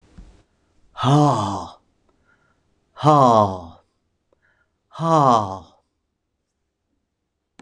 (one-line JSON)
{"exhalation_length": "7.6 s", "exhalation_amplitude": 26021, "exhalation_signal_mean_std_ratio": 0.37, "survey_phase": "beta (2021-08-13 to 2022-03-07)", "age": "65+", "gender": "Male", "wearing_mask": "No", "symptom_none": true, "smoker_status": "Ex-smoker", "respiratory_condition_asthma": false, "respiratory_condition_other": false, "recruitment_source": "REACT", "submission_delay": "8 days", "covid_test_result": "Negative", "covid_test_method": "RT-qPCR", "influenza_a_test_result": "Negative", "influenza_b_test_result": "Negative"}